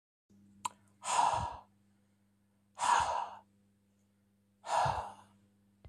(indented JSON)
{
  "exhalation_length": "5.9 s",
  "exhalation_amplitude": 4438,
  "exhalation_signal_mean_std_ratio": 0.41,
  "survey_phase": "beta (2021-08-13 to 2022-03-07)",
  "age": "45-64",
  "gender": "Male",
  "wearing_mask": "No",
  "symptom_none": true,
  "smoker_status": "Ex-smoker",
  "respiratory_condition_asthma": false,
  "respiratory_condition_other": false,
  "recruitment_source": "REACT",
  "submission_delay": "1 day",
  "covid_test_result": "Negative",
  "covid_test_method": "RT-qPCR"
}